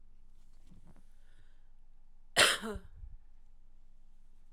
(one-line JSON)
{"cough_length": "4.5 s", "cough_amplitude": 11863, "cough_signal_mean_std_ratio": 0.39, "survey_phase": "alpha (2021-03-01 to 2021-08-12)", "age": "18-44", "gender": "Female", "wearing_mask": "No", "symptom_cough_any": true, "symptom_onset": "8 days", "smoker_status": "Ex-smoker", "respiratory_condition_asthma": false, "respiratory_condition_other": false, "recruitment_source": "REACT", "submission_delay": "1 day", "covid_test_result": "Negative", "covid_test_method": "RT-qPCR"}